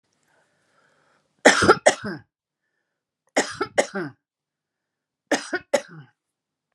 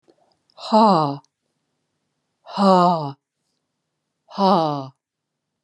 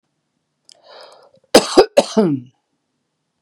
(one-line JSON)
{"three_cough_length": "6.7 s", "three_cough_amplitude": 31683, "three_cough_signal_mean_std_ratio": 0.27, "exhalation_length": "5.6 s", "exhalation_amplitude": 25120, "exhalation_signal_mean_std_ratio": 0.38, "cough_length": "3.4 s", "cough_amplitude": 32768, "cough_signal_mean_std_ratio": 0.28, "survey_phase": "beta (2021-08-13 to 2022-03-07)", "age": "65+", "gender": "Female", "wearing_mask": "No", "symptom_none": true, "smoker_status": "Ex-smoker", "respiratory_condition_asthma": false, "respiratory_condition_other": false, "recruitment_source": "REACT", "submission_delay": "0 days", "covid_test_result": "Negative", "covid_test_method": "RT-qPCR", "influenza_a_test_result": "Negative", "influenza_b_test_result": "Negative"}